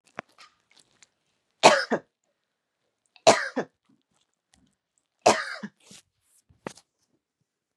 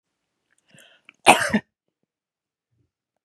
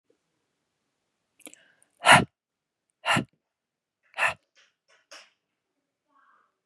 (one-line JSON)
{"three_cough_length": "7.8 s", "three_cough_amplitude": 32274, "three_cough_signal_mean_std_ratio": 0.21, "cough_length": "3.2 s", "cough_amplitude": 32768, "cough_signal_mean_std_ratio": 0.2, "exhalation_length": "6.7 s", "exhalation_amplitude": 26867, "exhalation_signal_mean_std_ratio": 0.19, "survey_phase": "beta (2021-08-13 to 2022-03-07)", "age": "18-44", "gender": "Female", "wearing_mask": "No", "symptom_none": true, "smoker_status": "Never smoked", "respiratory_condition_asthma": false, "respiratory_condition_other": false, "recruitment_source": "REACT", "submission_delay": "5 days", "covid_test_result": "Negative", "covid_test_method": "RT-qPCR", "influenza_a_test_result": "Negative", "influenza_b_test_result": "Negative"}